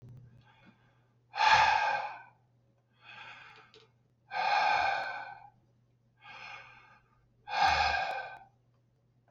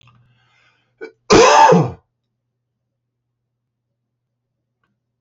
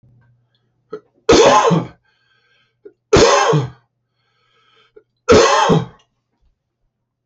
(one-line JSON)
{"exhalation_length": "9.3 s", "exhalation_amplitude": 10352, "exhalation_signal_mean_std_ratio": 0.44, "cough_length": "5.2 s", "cough_amplitude": 32047, "cough_signal_mean_std_ratio": 0.29, "three_cough_length": "7.3 s", "three_cough_amplitude": 31637, "three_cough_signal_mean_std_ratio": 0.41, "survey_phase": "alpha (2021-03-01 to 2021-08-12)", "age": "45-64", "gender": "Male", "wearing_mask": "No", "symptom_cough_any": true, "symptom_onset": "2 days", "smoker_status": "Never smoked", "respiratory_condition_asthma": false, "respiratory_condition_other": false, "recruitment_source": "Test and Trace", "submission_delay": "1 day", "covid_test_result": "Positive", "covid_test_method": "RT-qPCR", "covid_ct_value": 15.3, "covid_ct_gene": "ORF1ab gene", "covid_ct_mean": 15.7, "covid_viral_load": "7000000 copies/ml", "covid_viral_load_category": "High viral load (>1M copies/ml)"}